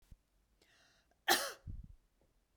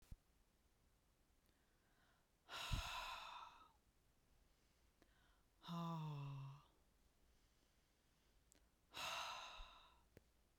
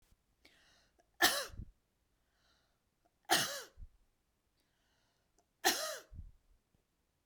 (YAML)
cough_length: 2.6 s
cough_amplitude: 6068
cough_signal_mean_std_ratio: 0.27
exhalation_length: 10.6 s
exhalation_amplitude: 894
exhalation_signal_mean_std_ratio: 0.48
three_cough_length: 7.3 s
three_cough_amplitude: 6691
three_cough_signal_mean_std_ratio: 0.27
survey_phase: beta (2021-08-13 to 2022-03-07)
age: 45-64
gender: Female
wearing_mask: 'No'
symptom_none: true
smoker_status: Never smoked
respiratory_condition_asthma: false
respiratory_condition_other: false
recruitment_source: REACT
submission_delay: 1 day
covid_test_result: Negative
covid_test_method: RT-qPCR
influenza_a_test_result: Negative
influenza_b_test_result: Negative